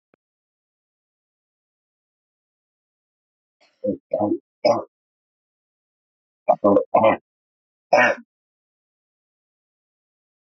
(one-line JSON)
{"cough_length": "10.6 s", "cough_amplitude": 19852, "cough_signal_mean_std_ratio": 0.26, "survey_phase": "beta (2021-08-13 to 2022-03-07)", "age": "45-64", "gender": "Female", "wearing_mask": "No", "symptom_cough_any": true, "symptom_new_continuous_cough": true, "symptom_runny_or_blocked_nose": true, "symptom_shortness_of_breath": true, "symptom_sore_throat": true, "symptom_onset": "5 days", "smoker_status": "Never smoked", "respiratory_condition_asthma": true, "respiratory_condition_other": false, "recruitment_source": "Test and Trace", "submission_delay": "1 day", "covid_test_result": "Positive", "covid_test_method": "RT-qPCR", "covid_ct_value": 20.6, "covid_ct_gene": "ORF1ab gene", "covid_ct_mean": 21.1, "covid_viral_load": "120000 copies/ml", "covid_viral_load_category": "Low viral load (10K-1M copies/ml)"}